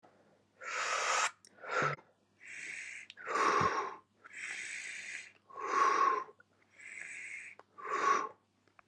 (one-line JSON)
{"exhalation_length": "8.9 s", "exhalation_amplitude": 4268, "exhalation_signal_mean_std_ratio": 0.56, "survey_phase": "alpha (2021-03-01 to 2021-08-12)", "age": "18-44", "gender": "Male", "wearing_mask": "No", "symptom_cough_any": true, "symptom_new_continuous_cough": true, "symptom_fever_high_temperature": true, "symptom_onset": "2 days", "smoker_status": "Never smoked", "respiratory_condition_asthma": false, "respiratory_condition_other": false, "recruitment_source": "Test and Trace", "submission_delay": "2 days", "covid_test_result": "Positive", "covid_test_method": "RT-qPCR"}